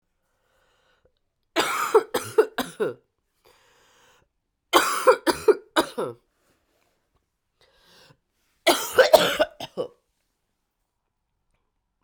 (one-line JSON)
{"three_cough_length": "12.0 s", "three_cough_amplitude": 32767, "three_cough_signal_mean_std_ratio": 0.3, "survey_phase": "alpha (2021-03-01 to 2021-08-12)", "age": "45-64", "gender": "Female", "wearing_mask": "No", "symptom_cough_any": true, "symptom_new_continuous_cough": true, "symptom_abdominal_pain": true, "symptom_diarrhoea": true, "symptom_fatigue": true, "symptom_fever_high_temperature": true, "symptom_headache": true, "symptom_onset": "2 days", "smoker_status": "Ex-smoker", "respiratory_condition_asthma": false, "respiratory_condition_other": false, "recruitment_source": "Test and Trace", "submission_delay": "1 day", "covid_test_result": "Positive", "covid_test_method": "RT-qPCR"}